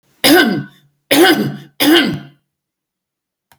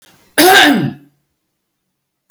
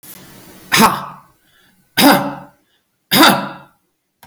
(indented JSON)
{
  "three_cough_length": "3.6 s",
  "three_cough_amplitude": 32768,
  "three_cough_signal_mean_std_ratio": 0.48,
  "cough_length": "2.3 s",
  "cough_amplitude": 32768,
  "cough_signal_mean_std_ratio": 0.42,
  "exhalation_length": "4.3 s",
  "exhalation_amplitude": 32768,
  "exhalation_signal_mean_std_ratio": 0.39,
  "survey_phase": "beta (2021-08-13 to 2022-03-07)",
  "age": "45-64",
  "gender": "Female",
  "wearing_mask": "No",
  "symptom_none": true,
  "smoker_status": "Ex-smoker",
  "respiratory_condition_asthma": false,
  "respiratory_condition_other": false,
  "recruitment_source": "REACT",
  "submission_delay": "7 days",
  "covid_test_result": "Negative",
  "covid_test_method": "RT-qPCR",
  "influenza_a_test_result": "Negative",
  "influenza_b_test_result": "Negative"
}